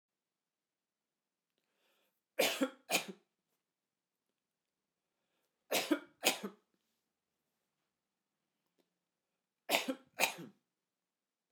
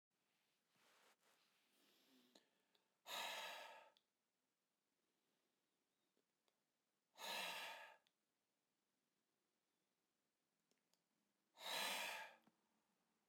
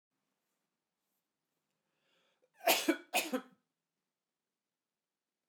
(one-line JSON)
{"three_cough_length": "11.5 s", "three_cough_amplitude": 8685, "three_cough_signal_mean_std_ratio": 0.24, "exhalation_length": "13.3 s", "exhalation_amplitude": 626, "exhalation_signal_mean_std_ratio": 0.33, "cough_length": "5.5 s", "cough_amplitude": 5647, "cough_signal_mean_std_ratio": 0.22, "survey_phase": "beta (2021-08-13 to 2022-03-07)", "age": "45-64", "gender": "Male", "wearing_mask": "No", "symptom_none": true, "smoker_status": "Never smoked", "respiratory_condition_asthma": false, "respiratory_condition_other": false, "recruitment_source": "REACT", "submission_delay": "1 day", "covid_test_result": "Negative", "covid_test_method": "RT-qPCR", "influenza_a_test_result": "Unknown/Void", "influenza_b_test_result": "Unknown/Void"}